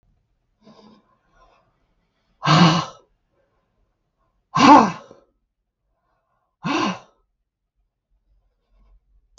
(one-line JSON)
{"exhalation_length": "9.4 s", "exhalation_amplitude": 32766, "exhalation_signal_mean_std_ratio": 0.25, "survey_phase": "beta (2021-08-13 to 2022-03-07)", "age": "65+", "gender": "Female", "wearing_mask": "No", "symptom_none": true, "smoker_status": "Ex-smoker", "respiratory_condition_asthma": false, "respiratory_condition_other": false, "recruitment_source": "REACT", "submission_delay": "1 day", "covid_test_result": "Negative", "covid_test_method": "RT-qPCR", "influenza_a_test_result": "Negative", "influenza_b_test_result": "Negative"}